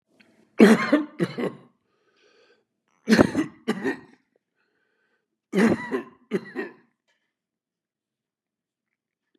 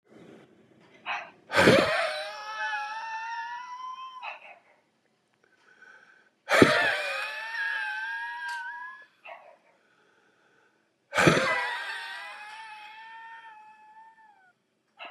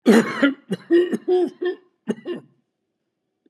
{"three_cough_length": "9.4 s", "three_cough_amplitude": 30556, "three_cough_signal_mean_std_ratio": 0.3, "exhalation_length": "15.1 s", "exhalation_amplitude": 25685, "exhalation_signal_mean_std_ratio": 0.44, "cough_length": "3.5 s", "cough_amplitude": 25138, "cough_signal_mean_std_ratio": 0.47, "survey_phase": "beta (2021-08-13 to 2022-03-07)", "age": "65+", "gender": "Male", "wearing_mask": "No", "symptom_runny_or_blocked_nose": true, "smoker_status": "Ex-smoker", "respiratory_condition_asthma": false, "respiratory_condition_other": true, "recruitment_source": "REACT", "submission_delay": "1 day", "covid_test_result": "Negative", "covid_test_method": "RT-qPCR", "influenza_a_test_result": "Negative", "influenza_b_test_result": "Negative"}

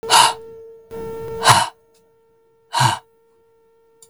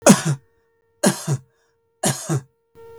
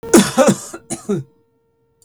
{"exhalation_length": "4.1 s", "exhalation_amplitude": 32768, "exhalation_signal_mean_std_ratio": 0.39, "three_cough_length": "3.0 s", "three_cough_amplitude": 32768, "three_cough_signal_mean_std_ratio": 0.37, "cough_length": "2.0 s", "cough_amplitude": 32768, "cough_signal_mean_std_ratio": 0.42, "survey_phase": "beta (2021-08-13 to 2022-03-07)", "age": "45-64", "gender": "Male", "wearing_mask": "No", "symptom_runny_or_blocked_nose": true, "symptom_sore_throat": true, "symptom_onset": "2 days", "smoker_status": "Never smoked", "respiratory_condition_asthma": false, "respiratory_condition_other": false, "recruitment_source": "Test and Trace", "submission_delay": "1 day", "covid_test_result": "Negative", "covid_test_method": "RT-qPCR"}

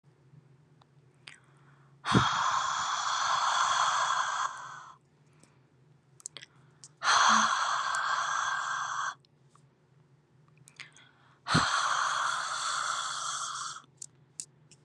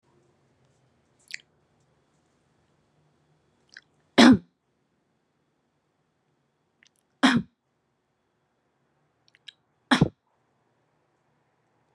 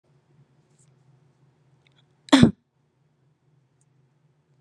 {"exhalation_length": "14.8 s", "exhalation_amplitude": 12561, "exhalation_signal_mean_std_ratio": 0.6, "three_cough_length": "11.9 s", "three_cough_amplitude": 29275, "three_cough_signal_mean_std_ratio": 0.16, "cough_length": "4.6 s", "cough_amplitude": 32768, "cough_signal_mean_std_ratio": 0.16, "survey_phase": "beta (2021-08-13 to 2022-03-07)", "age": "18-44", "gender": "Female", "wearing_mask": "Yes", "symptom_none": true, "smoker_status": "Ex-smoker", "respiratory_condition_asthma": false, "respiratory_condition_other": false, "recruitment_source": "REACT", "submission_delay": "1 day", "covid_test_result": "Negative", "covid_test_method": "RT-qPCR", "influenza_a_test_result": "Negative", "influenza_b_test_result": "Negative"}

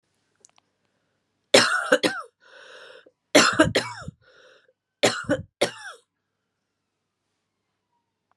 {"three_cough_length": "8.4 s", "three_cough_amplitude": 30727, "three_cough_signal_mean_std_ratio": 0.3, "survey_phase": "beta (2021-08-13 to 2022-03-07)", "age": "45-64", "gender": "Female", "wearing_mask": "No", "symptom_runny_or_blocked_nose": true, "symptom_fatigue": true, "symptom_fever_high_temperature": true, "symptom_headache": true, "smoker_status": "Ex-smoker", "respiratory_condition_asthma": false, "respiratory_condition_other": false, "recruitment_source": "Test and Trace", "submission_delay": "3 days", "covid_test_result": "Positive", "covid_test_method": "RT-qPCR"}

